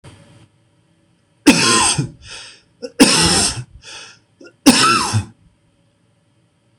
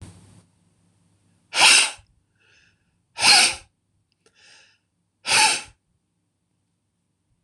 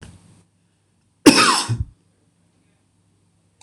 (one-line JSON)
{"three_cough_length": "6.8 s", "three_cough_amplitude": 26028, "three_cough_signal_mean_std_ratio": 0.42, "exhalation_length": "7.4 s", "exhalation_amplitude": 25988, "exhalation_signal_mean_std_ratio": 0.29, "cough_length": "3.6 s", "cough_amplitude": 26028, "cough_signal_mean_std_ratio": 0.27, "survey_phase": "beta (2021-08-13 to 2022-03-07)", "age": "45-64", "gender": "Male", "wearing_mask": "No", "symptom_none": true, "smoker_status": "Ex-smoker", "respiratory_condition_asthma": false, "respiratory_condition_other": false, "recruitment_source": "REACT", "submission_delay": "1 day", "covid_test_result": "Negative", "covid_test_method": "RT-qPCR", "influenza_a_test_result": "Unknown/Void", "influenza_b_test_result": "Unknown/Void"}